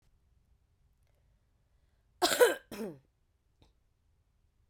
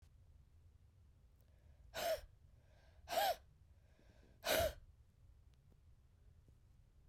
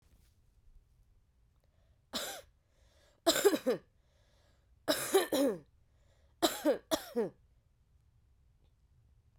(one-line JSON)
{"cough_length": "4.7 s", "cough_amplitude": 9936, "cough_signal_mean_std_ratio": 0.22, "exhalation_length": "7.1 s", "exhalation_amplitude": 2083, "exhalation_signal_mean_std_ratio": 0.35, "three_cough_length": "9.4 s", "three_cough_amplitude": 7037, "three_cough_signal_mean_std_ratio": 0.33, "survey_phase": "beta (2021-08-13 to 2022-03-07)", "age": "45-64", "gender": "Female", "wearing_mask": "No", "symptom_cough_any": true, "symptom_runny_or_blocked_nose": true, "symptom_headache": true, "symptom_change_to_sense_of_smell_or_taste": true, "symptom_other": true, "symptom_onset": "9 days", "smoker_status": "Never smoked", "respiratory_condition_asthma": false, "respiratory_condition_other": false, "recruitment_source": "Test and Trace", "submission_delay": "0 days", "covid_test_result": "Positive", "covid_test_method": "ePCR"}